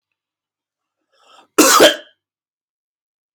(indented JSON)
{
  "cough_length": "3.3 s",
  "cough_amplitude": 32767,
  "cough_signal_mean_std_ratio": 0.27,
  "survey_phase": "beta (2021-08-13 to 2022-03-07)",
  "age": "45-64",
  "gender": "Male",
  "wearing_mask": "No",
  "symptom_cough_any": true,
  "symptom_runny_or_blocked_nose": true,
  "symptom_shortness_of_breath": true,
  "symptom_sore_throat": true,
  "symptom_abdominal_pain": true,
  "symptom_fatigue": true,
  "symptom_fever_high_temperature": true,
  "symptom_headache": true,
  "symptom_change_to_sense_of_smell_or_taste": true,
  "symptom_loss_of_taste": true,
  "symptom_onset": "3 days",
  "smoker_status": "Ex-smoker",
  "respiratory_condition_asthma": false,
  "respiratory_condition_other": false,
  "recruitment_source": "Test and Trace",
  "submission_delay": "2 days",
  "covid_test_result": "Positive",
  "covid_test_method": "RT-qPCR",
  "covid_ct_value": 18.0,
  "covid_ct_gene": "ORF1ab gene",
  "covid_ct_mean": 19.3,
  "covid_viral_load": "480000 copies/ml",
  "covid_viral_load_category": "Low viral load (10K-1M copies/ml)"
}